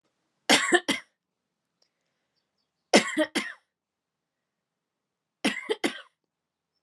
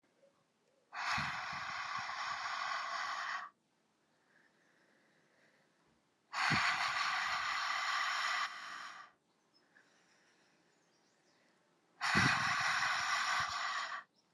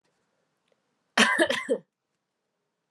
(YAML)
three_cough_length: 6.8 s
three_cough_amplitude: 21692
three_cough_signal_mean_std_ratio: 0.27
exhalation_length: 14.3 s
exhalation_amplitude: 3866
exhalation_signal_mean_std_ratio: 0.61
cough_length: 2.9 s
cough_amplitude: 21191
cough_signal_mean_std_ratio: 0.32
survey_phase: alpha (2021-03-01 to 2021-08-12)
age: 18-44
gender: Female
wearing_mask: 'No'
symptom_cough_any: true
symptom_fatigue: true
symptom_headache: true
symptom_onset: 7 days
smoker_status: Never smoked
respiratory_condition_asthma: false
respiratory_condition_other: false
recruitment_source: Test and Trace
submission_delay: 1 day
covid_test_result: Positive
covid_test_method: RT-qPCR